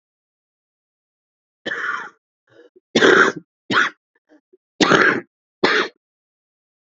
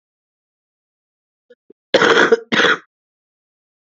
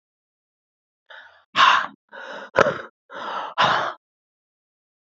{
  "three_cough_length": "6.9 s",
  "three_cough_amplitude": 30146,
  "three_cough_signal_mean_std_ratio": 0.35,
  "cough_length": "3.8 s",
  "cough_amplitude": 28525,
  "cough_signal_mean_std_ratio": 0.33,
  "exhalation_length": "5.1 s",
  "exhalation_amplitude": 26980,
  "exhalation_signal_mean_std_ratio": 0.35,
  "survey_phase": "beta (2021-08-13 to 2022-03-07)",
  "age": "45-64",
  "gender": "Female",
  "wearing_mask": "No",
  "symptom_cough_any": true,
  "symptom_runny_or_blocked_nose": true,
  "symptom_sore_throat": true,
  "symptom_abdominal_pain": true,
  "symptom_diarrhoea": true,
  "symptom_fatigue": true,
  "symptom_fever_high_temperature": true,
  "symptom_headache": true,
  "symptom_change_to_sense_of_smell_or_taste": true,
  "symptom_loss_of_taste": true,
  "symptom_onset": "6 days",
  "smoker_status": "Ex-smoker",
  "respiratory_condition_asthma": true,
  "respiratory_condition_other": false,
  "recruitment_source": "Test and Trace",
  "submission_delay": "1 day",
  "covid_test_result": "Positive",
  "covid_test_method": "RT-qPCR",
  "covid_ct_value": 12.4,
  "covid_ct_gene": "ORF1ab gene",
  "covid_ct_mean": 12.6,
  "covid_viral_load": "76000000 copies/ml",
  "covid_viral_load_category": "High viral load (>1M copies/ml)"
}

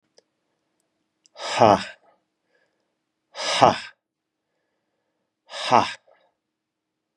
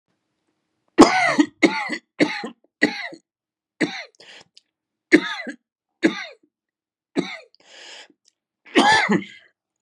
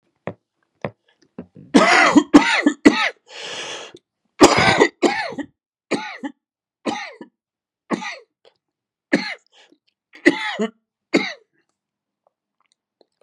{
  "exhalation_length": "7.2 s",
  "exhalation_amplitude": 32415,
  "exhalation_signal_mean_std_ratio": 0.24,
  "three_cough_length": "9.8 s",
  "three_cough_amplitude": 32768,
  "three_cough_signal_mean_std_ratio": 0.33,
  "cough_length": "13.2 s",
  "cough_amplitude": 32768,
  "cough_signal_mean_std_ratio": 0.34,
  "survey_phase": "beta (2021-08-13 to 2022-03-07)",
  "age": "45-64",
  "gender": "Male",
  "wearing_mask": "No",
  "symptom_cough_any": true,
  "symptom_new_continuous_cough": true,
  "symptom_runny_or_blocked_nose": true,
  "symptom_shortness_of_breath": true,
  "symptom_sore_throat": true,
  "symptom_fatigue": true,
  "symptom_fever_high_temperature": true,
  "symptom_headache": true,
  "symptom_change_to_sense_of_smell_or_taste": true,
  "symptom_onset": "5 days",
  "smoker_status": "Never smoked",
  "respiratory_condition_asthma": false,
  "respiratory_condition_other": false,
  "recruitment_source": "Test and Trace",
  "submission_delay": "1 day",
  "covid_test_result": "Positive",
  "covid_test_method": "RT-qPCR",
  "covid_ct_value": 19.6,
  "covid_ct_gene": "ORF1ab gene"
}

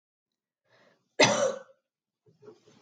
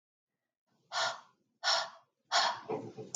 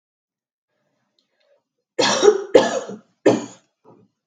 {
  "cough_length": "2.8 s",
  "cough_amplitude": 13357,
  "cough_signal_mean_std_ratio": 0.28,
  "exhalation_length": "3.2 s",
  "exhalation_amplitude": 6240,
  "exhalation_signal_mean_std_ratio": 0.45,
  "three_cough_length": "4.3 s",
  "three_cough_amplitude": 32768,
  "three_cough_signal_mean_std_ratio": 0.33,
  "survey_phase": "beta (2021-08-13 to 2022-03-07)",
  "age": "45-64",
  "gender": "Female",
  "wearing_mask": "No",
  "symptom_none": true,
  "smoker_status": "Never smoked",
  "respiratory_condition_asthma": false,
  "respiratory_condition_other": false,
  "recruitment_source": "REACT",
  "submission_delay": "1 day",
  "covid_test_result": "Negative",
  "covid_test_method": "RT-qPCR"
}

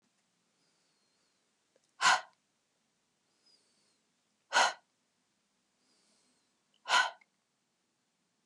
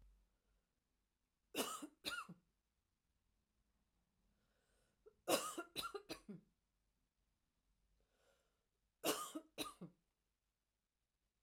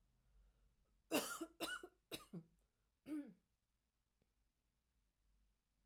{
  "exhalation_length": "8.5 s",
  "exhalation_amplitude": 9121,
  "exhalation_signal_mean_std_ratio": 0.21,
  "three_cough_length": "11.4 s",
  "three_cough_amplitude": 2385,
  "three_cough_signal_mean_std_ratio": 0.28,
  "cough_length": "5.9 s",
  "cough_amplitude": 1571,
  "cough_signal_mean_std_ratio": 0.32,
  "survey_phase": "alpha (2021-03-01 to 2021-08-12)",
  "age": "45-64",
  "gender": "Female",
  "wearing_mask": "No",
  "symptom_none": true,
  "smoker_status": "Never smoked",
  "respiratory_condition_asthma": false,
  "respiratory_condition_other": false,
  "recruitment_source": "REACT",
  "submission_delay": "7 days",
  "covid_test_result": "Negative",
  "covid_test_method": "RT-qPCR"
}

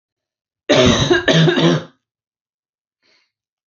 {
  "three_cough_length": "3.7 s",
  "three_cough_amplitude": 30181,
  "three_cough_signal_mean_std_ratio": 0.46,
  "survey_phase": "alpha (2021-03-01 to 2021-08-12)",
  "age": "18-44",
  "gender": "Female",
  "wearing_mask": "No",
  "symptom_none": true,
  "smoker_status": "Never smoked",
  "respiratory_condition_asthma": false,
  "respiratory_condition_other": false,
  "recruitment_source": "REACT",
  "submission_delay": "2 days",
  "covid_test_result": "Negative",
  "covid_test_method": "RT-qPCR"
}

